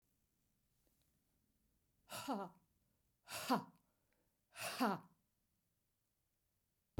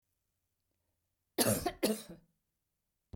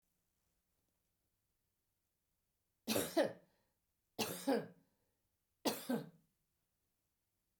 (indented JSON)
{
  "exhalation_length": "7.0 s",
  "exhalation_amplitude": 2006,
  "exhalation_signal_mean_std_ratio": 0.29,
  "cough_length": "3.2 s",
  "cough_amplitude": 6799,
  "cough_signal_mean_std_ratio": 0.31,
  "three_cough_length": "7.6 s",
  "three_cough_amplitude": 3041,
  "three_cough_signal_mean_std_ratio": 0.29,
  "survey_phase": "beta (2021-08-13 to 2022-03-07)",
  "age": "65+",
  "gender": "Female",
  "wearing_mask": "No",
  "symptom_none": true,
  "smoker_status": "Never smoked",
  "respiratory_condition_asthma": false,
  "respiratory_condition_other": false,
  "recruitment_source": "REACT",
  "submission_delay": "0 days",
  "covid_test_result": "Negative",
  "covid_test_method": "RT-qPCR"
}